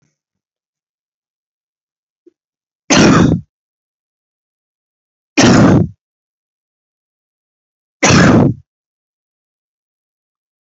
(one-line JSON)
{"three_cough_length": "10.7 s", "three_cough_amplitude": 32767, "three_cough_signal_mean_std_ratio": 0.32, "survey_phase": "beta (2021-08-13 to 2022-03-07)", "age": "18-44", "gender": "Male", "wearing_mask": "No", "symptom_cough_any": true, "symptom_new_continuous_cough": true, "symptom_runny_or_blocked_nose": true, "symptom_shortness_of_breath": true, "symptom_sore_throat": true, "symptom_fatigue": true, "symptom_headache": true, "symptom_change_to_sense_of_smell_or_taste": true, "symptom_loss_of_taste": true, "smoker_status": "Never smoked", "respiratory_condition_asthma": false, "respiratory_condition_other": false, "recruitment_source": "Test and Trace", "submission_delay": "2 days", "covid_test_result": "Positive", "covid_test_method": "LFT"}